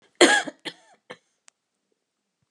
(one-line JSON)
{"cough_length": "2.5 s", "cough_amplitude": 27885, "cough_signal_mean_std_ratio": 0.24, "survey_phase": "alpha (2021-03-01 to 2021-08-12)", "age": "65+", "gender": "Female", "wearing_mask": "No", "symptom_abdominal_pain": true, "symptom_diarrhoea": true, "symptom_fatigue": true, "symptom_headache": true, "symptom_onset": "12 days", "smoker_status": "Never smoked", "respiratory_condition_asthma": false, "respiratory_condition_other": false, "recruitment_source": "REACT", "submission_delay": "1 day", "covid_test_result": "Negative", "covid_test_method": "RT-qPCR"}